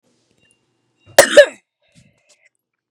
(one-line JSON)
{"cough_length": "2.9 s", "cough_amplitude": 32768, "cough_signal_mean_std_ratio": 0.21, "survey_phase": "beta (2021-08-13 to 2022-03-07)", "age": "18-44", "gender": "Female", "wearing_mask": "No", "symptom_cough_any": true, "symptom_runny_or_blocked_nose": true, "symptom_shortness_of_breath": true, "symptom_fatigue": true, "symptom_loss_of_taste": true, "smoker_status": "Never smoked", "respiratory_condition_asthma": true, "respiratory_condition_other": false, "recruitment_source": "Test and Trace", "submission_delay": "1 day", "covid_test_result": "Positive", "covid_test_method": "RT-qPCR", "covid_ct_value": 18.6, "covid_ct_gene": "ORF1ab gene", "covid_ct_mean": 19.1, "covid_viral_load": "550000 copies/ml", "covid_viral_load_category": "Low viral load (10K-1M copies/ml)"}